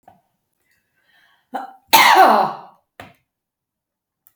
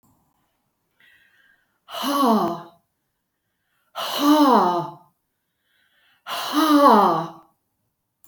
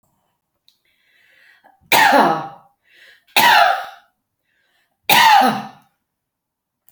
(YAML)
cough_length: 4.4 s
cough_amplitude: 32768
cough_signal_mean_std_ratio: 0.31
exhalation_length: 8.3 s
exhalation_amplitude: 25451
exhalation_signal_mean_std_ratio: 0.43
three_cough_length: 6.9 s
three_cough_amplitude: 32768
three_cough_signal_mean_std_ratio: 0.39
survey_phase: beta (2021-08-13 to 2022-03-07)
age: 65+
gender: Female
wearing_mask: 'No'
symptom_none: true
smoker_status: Never smoked
respiratory_condition_asthma: true
respiratory_condition_other: false
recruitment_source: REACT
submission_delay: 1 day
covid_test_result: Negative
covid_test_method: RT-qPCR